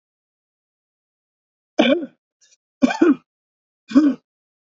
{"three_cough_length": "4.8 s", "three_cough_amplitude": 27139, "three_cough_signal_mean_std_ratio": 0.3, "survey_phase": "beta (2021-08-13 to 2022-03-07)", "age": "65+", "gender": "Male", "wearing_mask": "No", "symptom_cough_any": true, "symptom_runny_or_blocked_nose": true, "symptom_fatigue": true, "symptom_headache": true, "smoker_status": "Never smoked", "respiratory_condition_asthma": true, "respiratory_condition_other": false, "recruitment_source": "Test and Trace", "submission_delay": "2 days", "covid_test_result": "Positive", "covid_test_method": "RT-qPCR", "covid_ct_value": 14.6, "covid_ct_gene": "ORF1ab gene", "covid_ct_mean": 14.9, "covid_viral_load": "13000000 copies/ml", "covid_viral_load_category": "High viral load (>1M copies/ml)"}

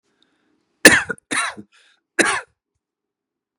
{"three_cough_length": "3.6 s", "three_cough_amplitude": 32768, "three_cough_signal_mean_std_ratio": 0.26, "survey_phase": "beta (2021-08-13 to 2022-03-07)", "age": "45-64", "gender": "Male", "wearing_mask": "No", "symptom_none": true, "smoker_status": "Ex-smoker", "respiratory_condition_asthma": false, "respiratory_condition_other": false, "recruitment_source": "REACT", "submission_delay": "7 days", "covid_test_result": "Negative", "covid_test_method": "RT-qPCR", "influenza_a_test_result": "Unknown/Void", "influenza_b_test_result": "Unknown/Void"}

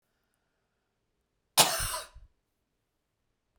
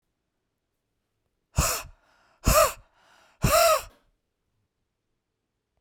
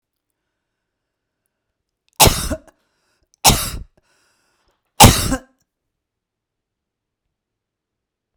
{"cough_length": "3.6 s", "cough_amplitude": 23851, "cough_signal_mean_std_ratio": 0.22, "exhalation_length": "5.8 s", "exhalation_amplitude": 16980, "exhalation_signal_mean_std_ratio": 0.31, "three_cough_length": "8.4 s", "three_cough_amplitude": 32768, "three_cough_signal_mean_std_ratio": 0.22, "survey_phase": "beta (2021-08-13 to 2022-03-07)", "age": "45-64", "gender": "Female", "wearing_mask": "No", "symptom_new_continuous_cough": true, "symptom_runny_or_blocked_nose": true, "symptom_onset": "4 days", "smoker_status": "Never smoked", "respiratory_condition_asthma": false, "respiratory_condition_other": false, "recruitment_source": "REACT", "submission_delay": "1 day", "covid_test_result": "Positive", "covid_test_method": "RT-qPCR", "covid_ct_value": 32.0, "covid_ct_gene": "E gene", "influenza_a_test_result": "Negative", "influenza_b_test_result": "Negative"}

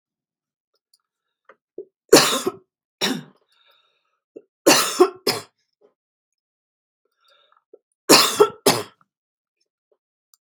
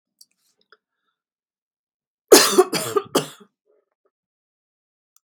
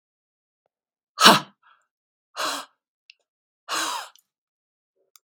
{"three_cough_length": "10.4 s", "three_cough_amplitude": 32768, "three_cough_signal_mean_std_ratio": 0.27, "cough_length": "5.3 s", "cough_amplitude": 32768, "cough_signal_mean_std_ratio": 0.23, "exhalation_length": "5.3 s", "exhalation_amplitude": 32767, "exhalation_signal_mean_std_ratio": 0.22, "survey_phase": "beta (2021-08-13 to 2022-03-07)", "age": "45-64", "gender": "Female", "wearing_mask": "No", "symptom_none": true, "smoker_status": "Ex-smoker", "respiratory_condition_asthma": false, "respiratory_condition_other": false, "recruitment_source": "REACT", "submission_delay": "4 days", "covid_test_result": "Negative", "covid_test_method": "RT-qPCR"}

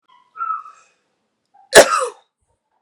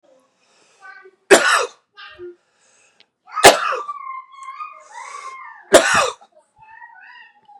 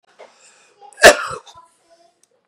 {"cough_length": "2.8 s", "cough_amplitude": 32768, "cough_signal_mean_std_ratio": 0.26, "three_cough_length": "7.6 s", "three_cough_amplitude": 32768, "three_cough_signal_mean_std_ratio": 0.32, "exhalation_length": "2.5 s", "exhalation_amplitude": 32768, "exhalation_signal_mean_std_ratio": 0.22, "survey_phase": "beta (2021-08-13 to 2022-03-07)", "age": "18-44", "gender": "Male", "wearing_mask": "No", "symptom_none": true, "smoker_status": "Never smoked", "respiratory_condition_asthma": false, "respiratory_condition_other": false, "recruitment_source": "REACT", "submission_delay": "1 day", "covid_test_result": "Negative", "covid_test_method": "RT-qPCR", "influenza_a_test_result": "Negative", "influenza_b_test_result": "Negative"}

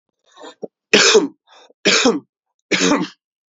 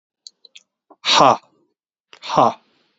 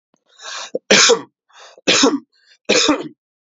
{"cough_length": "3.5 s", "cough_amplitude": 32768, "cough_signal_mean_std_ratio": 0.44, "exhalation_length": "3.0 s", "exhalation_amplitude": 32768, "exhalation_signal_mean_std_ratio": 0.31, "three_cough_length": "3.6 s", "three_cough_amplitude": 32768, "three_cough_signal_mean_std_ratio": 0.44, "survey_phase": "alpha (2021-03-01 to 2021-08-12)", "age": "18-44", "gender": "Male", "wearing_mask": "No", "symptom_none": true, "symptom_onset": "5 days", "smoker_status": "Never smoked", "respiratory_condition_asthma": false, "respiratory_condition_other": false, "recruitment_source": "Test and Trace", "submission_delay": "2 days", "covid_test_result": "Positive", "covid_test_method": "RT-qPCR", "covid_ct_value": 17.0, "covid_ct_gene": "N gene", "covid_ct_mean": 17.5, "covid_viral_load": "1900000 copies/ml", "covid_viral_load_category": "High viral load (>1M copies/ml)"}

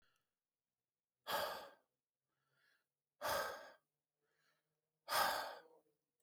{"exhalation_length": "6.2 s", "exhalation_amplitude": 2025, "exhalation_signal_mean_std_ratio": 0.34, "survey_phase": "alpha (2021-03-01 to 2021-08-12)", "age": "18-44", "gender": "Male", "wearing_mask": "No", "symptom_none": true, "smoker_status": "Never smoked", "respiratory_condition_asthma": false, "respiratory_condition_other": false, "recruitment_source": "REACT", "submission_delay": "1 day", "covid_test_result": "Negative", "covid_test_method": "RT-qPCR"}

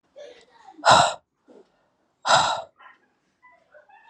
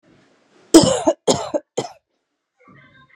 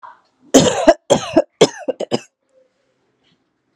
{"exhalation_length": "4.1 s", "exhalation_amplitude": 23741, "exhalation_signal_mean_std_ratio": 0.31, "three_cough_length": "3.2 s", "three_cough_amplitude": 32768, "three_cough_signal_mean_std_ratio": 0.3, "cough_length": "3.8 s", "cough_amplitude": 32768, "cough_signal_mean_std_ratio": 0.33, "survey_phase": "alpha (2021-03-01 to 2021-08-12)", "age": "18-44", "gender": "Female", "wearing_mask": "Yes", "symptom_new_continuous_cough": true, "symptom_diarrhoea": true, "symptom_fatigue": true, "symptom_fever_high_temperature": true, "symptom_headache": true, "symptom_change_to_sense_of_smell_or_taste": true, "smoker_status": "Current smoker (e-cigarettes or vapes only)", "respiratory_condition_asthma": false, "respiratory_condition_other": false, "recruitment_source": "Test and Trace", "submission_delay": "1 day", "covid_test_result": "Positive", "covid_test_method": "RT-qPCR"}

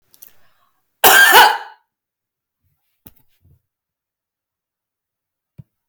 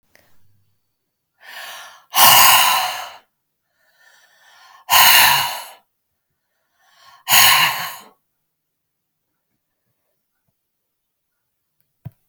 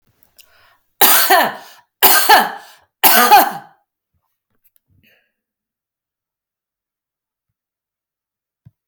{"cough_length": "5.9 s", "cough_amplitude": 32768, "cough_signal_mean_std_ratio": 0.25, "exhalation_length": "12.3 s", "exhalation_amplitude": 32768, "exhalation_signal_mean_std_ratio": 0.33, "three_cough_length": "8.9 s", "three_cough_amplitude": 32768, "three_cough_signal_mean_std_ratio": 0.33, "survey_phase": "alpha (2021-03-01 to 2021-08-12)", "age": "65+", "gender": "Female", "wearing_mask": "No", "symptom_none": true, "symptom_onset": "12 days", "smoker_status": "Never smoked", "respiratory_condition_asthma": false, "respiratory_condition_other": false, "recruitment_source": "REACT", "submission_delay": "6 days", "covid_test_result": "Negative", "covid_test_method": "RT-qPCR"}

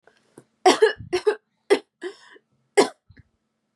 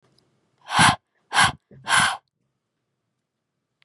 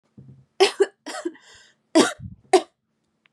{"cough_length": "3.8 s", "cough_amplitude": 27238, "cough_signal_mean_std_ratio": 0.3, "exhalation_length": "3.8 s", "exhalation_amplitude": 27209, "exhalation_signal_mean_std_ratio": 0.33, "three_cough_length": "3.3 s", "three_cough_amplitude": 24729, "three_cough_signal_mean_std_ratio": 0.3, "survey_phase": "beta (2021-08-13 to 2022-03-07)", "age": "18-44", "gender": "Female", "wearing_mask": "Yes", "symptom_fatigue": true, "symptom_headache": true, "symptom_onset": "8 days", "smoker_status": "Never smoked", "respiratory_condition_asthma": false, "respiratory_condition_other": false, "recruitment_source": "REACT", "submission_delay": "1 day", "covid_test_result": "Negative", "covid_test_method": "RT-qPCR", "influenza_a_test_result": "Negative", "influenza_b_test_result": "Negative"}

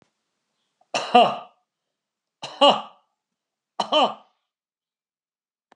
{"three_cough_length": "5.8 s", "three_cough_amplitude": 29234, "three_cough_signal_mean_std_ratio": 0.27, "survey_phase": "alpha (2021-03-01 to 2021-08-12)", "age": "45-64", "gender": "Male", "wearing_mask": "No", "symptom_none": true, "smoker_status": "Never smoked", "respiratory_condition_asthma": true, "respiratory_condition_other": false, "recruitment_source": "REACT", "submission_delay": "2 days", "covid_test_result": "Negative", "covid_test_method": "RT-qPCR"}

